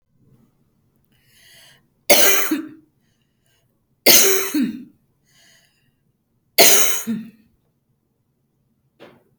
three_cough_length: 9.4 s
three_cough_amplitude: 32768
three_cough_signal_mean_std_ratio: 0.33
survey_phase: beta (2021-08-13 to 2022-03-07)
age: 65+
gender: Female
wearing_mask: 'No'
symptom_none: true
smoker_status: Never smoked
respiratory_condition_asthma: false
respiratory_condition_other: false
recruitment_source: REACT
submission_delay: 1 day
covid_test_result: Negative
covid_test_method: RT-qPCR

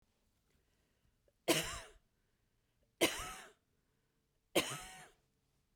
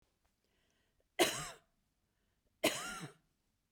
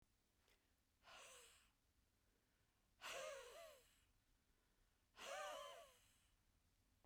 three_cough_length: 5.8 s
three_cough_amplitude: 5862
three_cough_signal_mean_std_ratio: 0.27
cough_length: 3.7 s
cough_amplitude: 5356
cough_signal_mean_std_ratio: 0.28
exhalation_length: 7.1 s
exhalation_amplitude: 289
exhalation_signal_mean_std_ratio: 0.47
survey_phase: beta (2021-08-13 to 2022-03-07)
age: 45-64
gender: Female
wearing_mask: 'No'
symptom_none: true
smoker_status: Never smoked
respiratory_condition_asthma: false
respiratory_condition_other: false
recruitment_source: REACT
submission_delay: 1 day
covid_test_result: Negative
covid_test_method: RT-qPCR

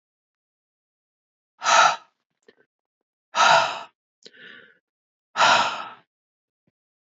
exhalation_length: 7.1 s
exhalation_amplitude: 23075
exhalation_signal_mean_std_ratio: 0.31
survey_phase: beta (2021-08-13 to 2022-03-07)
age: 45-64
gender: Female
wearing_mask: 'No'
symptom_cough_any: true
symptom_runny_or_blocked_nose: true
symptom_sore_throat: true
symptom_fatigue: true
symptom_onset: 2 days
smoker_status: Ex-smoker
respiratory_condition_asthma: false
respiratory_condition_other: false
recruitment_source: Test and Trace
submission_delay: 1 day
covid_test_result: Negative
covid_test_method: RT-qPCR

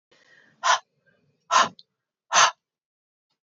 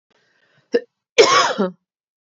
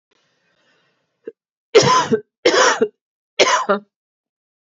exhalation_length: 3.5 s
exhalation_amplitude: 19811
exhalation_signal_mean_std_ratio: 0.29
cough_length: 2.4 s
cough_amplitude: 29974
cough_signal_mean_std_ratio: 0.36
three_cough_length: 4.8 s
three_cough_amplitude: 30323
three_cough_signal_mean_std_ratio: 0.39
survey_phase: beta (2021-08-13 to 2022-03-07)
age: 18-44
gender: Female
wearing_mask: 'No'
symptom_cough_any: true
symptom_runny_or_blocked_nose: true
symptom_sore_throat: true
symptom_fatigue: true
symptom_headache: true
symptom_other: true
symptom_onset: 8 days
smoker_status: Never smoked
respiratory_condition_asthma: false
respiratory_condition_other: false
recruitment_source: REACT
submission_delay: 1 day
covid_test_result: Positive
covid_test_method: RT-qPCR
covid_ct_value: 25.4
covid_ct_gene: E gene
influenza_a_test_result: Negative
influenza_b_test_result: Negative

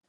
cough_length: 0.1 s
cough_amplitude: 39
cough_signal_mean_std_ratio: 0.66
survey_phase: alpha (2021-03-01 to 2021-08-12)
age: 65+
gender: Male
wearing_mask: 'No'
symptom_none: true
smoker_status: Ex-smoker
respiratory_condition_asthma: false
respiratory_condition_other: false
recruitment_source: REACT
submission_delay: 5 days
covid_test_result: Negative
covid_test_method: RT-qPCR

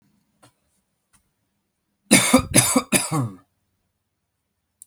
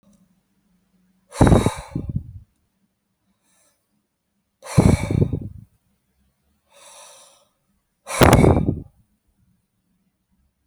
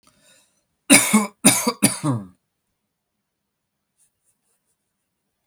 cough_length: 4.9 s
cough_amplitude: 32768
cough_signal_mean_std_ratio: 0.32
exhalation_length: 10.7 s
exhalation_amplitude: 32768
exhalation_signal_mean_std_ratio: 0.29
three_cough_length: 5.5 s
three_cough_amplitude: 32768
three_cough_signal_mean_std_ratio: 0.29
survey_phase: alpha (2021-03-01 to 2021-08-12)
age: 45-64
gender: Male
wearing_mask: 'No'
symptom_none: true
smoker_status: Never smoked
respiratory_condition_asthma: false
respiratory_condition_other: false
recruitment_source: REACT
submission_delay: 7 days
covid_test_result: Negative
covid_test_method: RT-qPCR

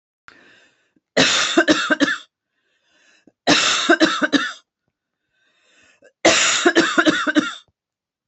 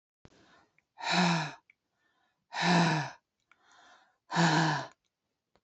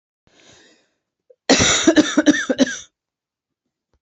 three_cough_length: 8.3 s
three_cough_amplitude: 30056
three_cough_signal_mean_std_ratio: 0.47
exhalation_length: 5.6 s
exhalation_amplitude: 7210
exhalation_signal_mean_std_ratio: 0.44
cough_length: 4.0 s
cough_amplitude: 32767
cough_signal_mean_std_ratio: 0.38
survey_phase: beta (2021-08-13 to 2022-03-07)
age: 45-64
gender: Female
wearing_mask: 'No'
symptom_cough_any: true
symptom_other: true
symptom_onset: 3 days
smoker_status: Never smoked
respiratory_condition_asthma: false
respiratory_condition_other: false
recruitment_source: Test and Trace
submission_delay: 1 day
covid_test_method: RT-qPCR
covid_ct_value: 29.2
covid_ct_gene: ORF1ab gene
covid_ct_mean: 30.1
covid_viral_load: 130 copies/ml
covid_viral_load_category: Minimal viral load (< 10K copies/ml)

